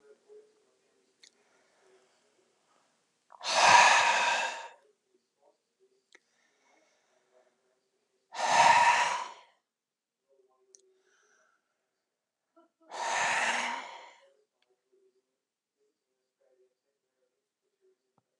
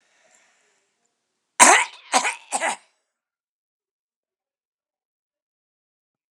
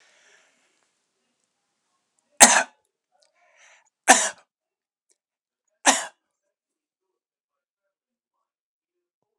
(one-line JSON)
{"exhalation_length": "18.4 s", "exhalation_amplitude": 14889, "exhalation_signal_mean_std_ratio": 0.29, "cough_length": "6.3 s", "cough_amplitude": 32768, "cough_signal_mean_std_ratio": 0.21, "three_cough_length": "9.4 s", "three_cough_amplitude": 32768, "three_cough_signal_mean_std_ratio": 0.17, "survey_phase": "beta (2021-08-13 to 2022-03-07)", "age": "65+", "gender": "Male", "wearing_mask": "No", "symptom_none": true, "smoker_status": "Ex-smoker", "respiratory_condition_asthma": false, "respiratory_condition_other": true, "recruitment_source": "REACT", "submission_delay": "3 days", "covid_test_result": "Negative", "covid_test_method": "RT-qPCR", "influenza_a_test_result": "Unknown/Void", "influenza_b_test_result": "Unknown/Void"}